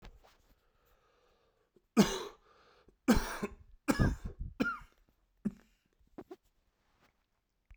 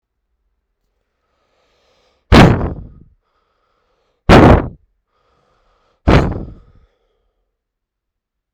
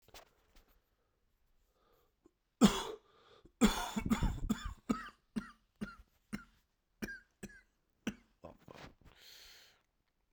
{"three_cough_length": "7.8 s", "three_cough_amplitude": 9697, "three_cough_signal_mean_std_ratio": 0.29, "exhalation_length": "8.5 s", "exhalation_amplitude": 32768, "exhalation_signal_mean_std_ratio": 0.27, "cough_length": "10.3 s", "cough_amplitude": 6743, "cough_signal_mean_std_ratio": 0.29, "survey_phase": "beta (2021-08-13 to 2022-03-07)", "age": "18-44", "gender": "Male", "wearing_mask": "No", "symptom_cough_any": true, "symptom_runny_or_blocked_nose": true, "symptom_sore_throat": true, "symptom_diarrhoea": true, "symptom_fatigue": true, "symptom_onset": "4 days", "smoker_status": "Current smoker (e-cigarettes or vapes only)", "respiratory_condition_asthma": false, "respiratory_condition_other": false, "recruitment_source": "Test and Trace", "submission_delay": "2 days", "covid_test_result": "Positive", "covid_test_method": "RT-qPCR", "covid_ct_value": 22.5, "covid_ct_gene": "N gene"}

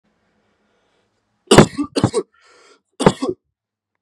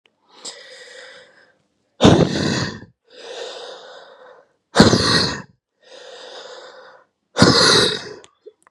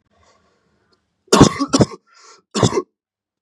{"three_cough_length": "4.0 s", "three_cough_amplitude": 32768, "three_cough_signal_mean_std_ratio": 0.26, "exhalation_length": "8.7 s", "exhalation_amplitude": 32768, "exhalation_signal_mean_std_ratio": 0.39, "cough_length": "3.4 s", "cough_amplitude": 32768, "cough_signal_mean_std_ratio": 0.31, "survey_phase": "beta (2021-08-13 to 2022-03-07)", "age": "18-44", "gender": "Male", "wearing_mask": "No", "symptom_new_continuous_cough": true, "symptom_runny_or_blocked_nose": true, "symptom_fatigue": true, "symptom_headache": true, "smoker_status": "Ex-smoker", "respiratory_condition_asthma": false, "respiratory_condition_other": false, "recruitment_source": "Test and Trace", "submission_delay": "2 days", "covid_test_result": "Positive", "covid_test_method": "RT-qPCR", "covid_ct_value": 27.6, "covid_ct_gene": "N gene"}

